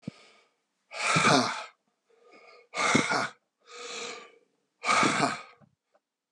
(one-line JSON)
{"exhalation_length": "6.3 s", "exhalation_amplitude": 13333, "exhalation_signal_mean_std_ratio": 0.45, "survey_phase": "beta (2021-08-13 to 2022-03-07)", "age": "65+", "gender": "Male", "wearing_mask": "No", "symptom_cough_any": true, "symptom_runny_or_blocked_nose": true, "symptom_sore_throat": true, "symptom_fever_high_temperature": true, "symptom_onset": "3 days", "smoker_status": "Ex-smoker", "respiratory_condition_asthma": false, "respiratory_condition_other": false, "recruitment_source": "Test and Trace", "submission_delay": "2 days", "covid_test_result": "Positive", "covid_test_method": "RT-qPCR", "covid_ct_value": 20.0, "covid_ct_gene": "ORF1ab gene", "covid_ct_mean": 20.1, "covid_viral_load": "250000 copies/ml", "covid_viral_load_category": "Low viral load (10K-1M copies/ml)"}